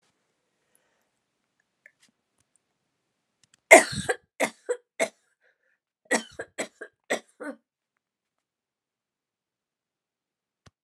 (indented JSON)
{
  "cough_length": "10.8 s",
  "cough_amplitude": 32635,
  "cough_signal_mean_std_ratio": 0.15,
  "survey_phase": "alpha (2021-03-01 to 2021-08-12)",
  "age": "65+",
  "gender": "Female",
  "wearing_mask": "No",
  "symptom_none": true,
  "smoker_status": "Ex-smoker",
  "respiratory_condition_asthma": false,
  "respiratory_condition_other": false,
  "recruitment_source": "REACT",
  "submission_delay": "1 day",
  "covid_test_result": "Negative",
  "covid_test_method": "RT-qPCR"
}